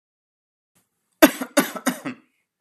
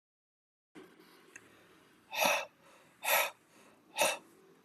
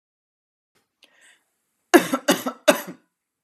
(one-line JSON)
{"cough_length": "2.6 s", "cough_amplitude": 32767, "cough_signal_mean_std_ratio": 0.24, "exhalation_length": "4.6 s", "exhalation_amplitude": 6225, "exhalation_signal_mean_std_ratio": 0.35, "three_cough_length": "3.4 s", "three_cough_amplitude": 32318, "three_cough_signal_mean_std_ratio": 0.24, "survey_phase": "alpha (2021-03-01 to 2021-08-12)", "age": "18-44", "gender": "Male", "wearing_mask": "No", "symptom_none": true, "smoker_status": "Never smoked", "respiratory_condition_asthma": false, "respiratory_condition_other": false, "recruitment_source": "REACT", "submission_delay": "1 day", "covid_test_result": "Negative", "covid_test_method": "RT-qPCR"}